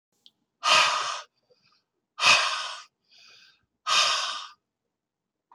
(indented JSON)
{
  "exhalation_length": "5.5 s",
  "exhalation_amplitude": 17155,
  "exhalation_signal_mean_std_ratio": 0.41,
  "survey_phase": "alpha (2021-03-01 to 2021-08-12)",
  "age": "45-64",
  "gender": "Male",
  "wearing_mask": "No",
  "symptom_none": true,
  "smoker_status": "Ex-smoker",
  "respiratory_condition_asthma": true,
  "respiratory_condition_other": false,
  "recruitment_source": "REACT",
  "submission_delay": "2 days",
  "covid_test_result": "Negative",
  "covid_test_method": "RT-qPCR"
}